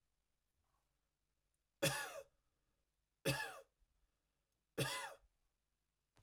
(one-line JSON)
{"three_cough_length": "6.2 s", "three_cough_amplitude": 2317, "three_cough_signal_mean_std_ratio": 0.3, "survey_phase": "beta (2021-08-13 to 2022-03-07)", "age": "45-64", "gender": "Male", "wearing_mask": "No", "symptom_none": true, "smoker_status": "Never smoked", "respiratory_condition_asthma": false, "respiratory_condition_other": false, "recruitment_source": "REACT", "submission_delay": "0 days", "covid_test_result": "Negative", "covid_test_method": "RT-qPCR"}